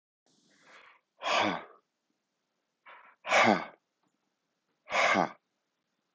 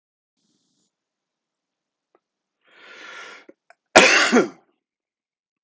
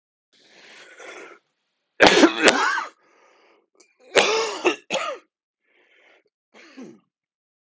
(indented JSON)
{
  "exhalation_length": "6.1 s",
  "exhalation_amplitude": 9328,
  "exhalation_signal_mean_std_ratio": 0.33,
  "cough_length": "5.6 s",
  "cough_amplitude": 30277,
  "cough_signal_mean_std_ratio": 0.24,
  "three_cough_length": "7.7 s",
  "three_cough_amplitude": 30277,
  "three_cough_signal_mean_std_ratio": 0.32,
  "survey_phase": "beta (2021-08-13 to 2022-03-07)",
  "age": "45-64",
  "gender": "Male",
  "wearing_mask": "No",
  "symptom_cough_any": true,
  "symptom_new_continuous_cough": true,
  "symptom_runny_or_blocked_nose": true,
  "symptom_fatigue": true,
  "symptom_headache": true,
  "symptom_change_to_sense_of_smell_or_taste": true,
  "symptom_loss_of_taste": true,
  "symptom_onset": "3 days",
  "smoker_status": "Ex-smoker",
  "respiratory_condition_asthma": false,
  "respiratory_condition_other": false,
  "recruitment_source": "Test and Trace",
  "submission_delay": "2 days",
  "covid_test_result": "Positive",
  "covid_test_method": "RT-qPCR"
}